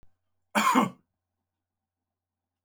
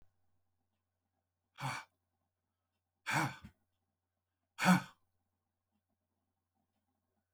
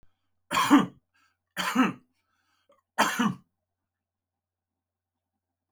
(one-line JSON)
{"cough_length": "2.6 s", "cough_amplitude": 11087, "cough_signal_mean_std_ratio": 0.29, "exhalation_length": "7.3 s", "exhalation_amplitude": 4782, "exhalation_signal_mean_std_ratio": 0.21, "three_cough_length": "5.7 s", "three_cough_amplitude": 15967, "three_cough_signal_mean_std_ratio": 0.3, "survey_phase": "alpha (2021-03-01 to 2021-08-12)", "age": "65+", "gender": "Male", "wearing_mask": "No", "symptom_none": true, "smoker_status": "Ex-smoker", "respiratory_condition_asthma": false, "respiratory_condition_other": false, "recruitment_source": "REACT", "submission_delay": "3 days", "covid_test_result": "Negative", "covid_test_method": "RT-qPCR"}